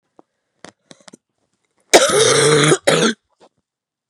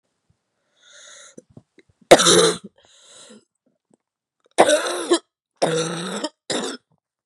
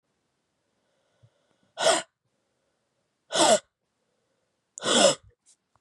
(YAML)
cough_length: 4.1 s
cough_amplitude: 32768
cough_signal_mean_std_ratio: 0.43
three_cough_length: 7.3 s
three_cough_amplitude: 32768
three_cough_signal_mean_std_ratio: 0.33
exhalation_length: 5.8 s
exhalation_amplitude: 16686
exhalation_signal_mean_std_ratio: 0.29
survey_phase: beta (2021-08-13 to 2022-03-07)
age: 18-44
gender: Female
wearing_mask: 'No'
symptom_cough_any: true
symptom_runny_or_blocked_nose: true
symptom_headache: true
symptom_loss_of_taste: true
smoker_status: Never smoked
respiratory_condition_asthma: false
respiratory_condition_other: false
recruitment_source: Test and Trace
submission_delay: 2 days
covid_test_result: Positive
covid_test_method: RT-qPCR
covid_ct_value: 11.4
covid_ct_gene: ORF1ab gene
covid_ct_mean: 11.7
covid_viral_load: 150000000 copies/ml
covid_viral_load_category: High viral load (>1M copies/ml)